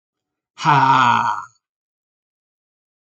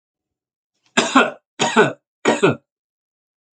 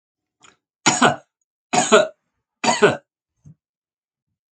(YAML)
exhalation_length: 3.1 s
exhalation_amplitude: 27371
exhalation_signal_mean_std_ratio: 0.4
cough_length: 3.6 s
cough_amplitude: 29105
cough_signal_mean_std_ratio: 0.37
three_cough_length: 4.5 s
three_cough_amplitude: 28274
three_cough_signal_mean_std_ratio: 0.33
survey_phase: alpha (2021-03-01 to 2021-08-12)
age: 65+
gender: Male
wearing_mask: 'No'
symptom_none: true
smoker_status: Ex-smoker
respiratory_condition_asthma: true
respiratory_condition_other: false
recruitment_source: REACT
submission_delay: 5 days
covid_test_result: Negative
covid_test_method: RT-qPCR